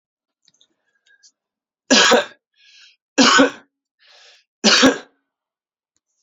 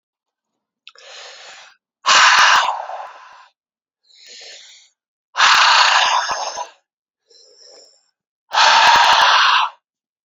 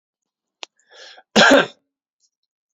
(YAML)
three_cough_length: 6.2 s
three_cough_amplitude: 32767
three_cough_signal_mean_std_ratio: 0.32
exhalation_length: 10.2 s
exhalation_amplitude: 32013
exhalation_signal_mean_std_ratio: 0.48
cough_length: 2.7 s
cough_amplitude: 30735
cough_signal_mean_std_ratio: 0.27
survey_phase: beta (2021-08-13 to 2022-03-07)
age: 18-44
gender: Male
wearing_mask: 'No'
symptom_cough_any: true
symptom_diarrhoea: true
symptom_fatigue: true
symptom_headache: true
symptom_change_to_sense_of_smell_or_taste: true
symptom_loss_of_taste: true
symptom_onset: 4 days
smoker_status: Never smoked
respiratory_condition_asthma: true
respiratory_condition_other: false
recruitment_source: Test and Trace
submission_delay: 4 days
covid_test_result: Positive
covid_test_method: RT-qPCR
covid_ct_value: 21.6
covid_ct_gene: ORF1ab gene